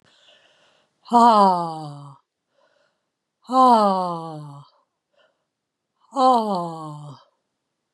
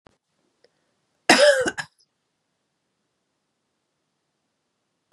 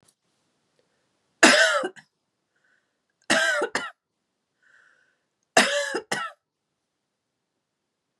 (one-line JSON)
{"exhalation_length": "7.9 s", "exhalation_amplitude": 23637, "exhalation_signal_mean_std_ratio": 0.38, "cough_length": "5.1 s", "cough_amplitude": 29003, "cough_signal_mean_std_ratio": 0.22, "three_cough_length": "8.2 s", "three_cough_amplitude": 31744, "three_cough_signal_mean_std_ratio": 0.3, "survey_phase": "beta (2021-08-13 to 2022-03-07)", "age": "45-64", "gender": "Female", "wearing_mask": "No", "symptom_none": true, "smoker_status": "Never smoked", "respiratory_condition_asthma": false, "respiratory_condition_other": false, "recruitment_source": "REACT", "submission_delay": "2 days", "covid_test_result": "Negative", "covid_test_method": "RT-qPCR"}